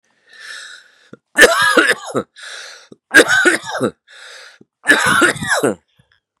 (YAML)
three_cough_length: 6.4 s
three_cough_amplitude: 32768
three_cough_signal_mean_std_ratio: 0.47
survey_phase: beta (2021-08-13 to 2022-03-07)
age: 45-64
gender: Male
wearing_mask: 'No'
symptom_cough_any: true
symptom_new_continuous_cough: true
symptom_runny_or_blocked_nose: true
symptom_fatigue: true
symptom_fever_high_temperature: true
symptom_headache: true
symptom_other: true
smoker_status: Never smoked
respiratory_condition_asthma: false
respiratory_condition_other: false
recruitment_source: Test and Trace
submission_delay: 2 days
covid_test_result: Positive
covid_test_method: LFT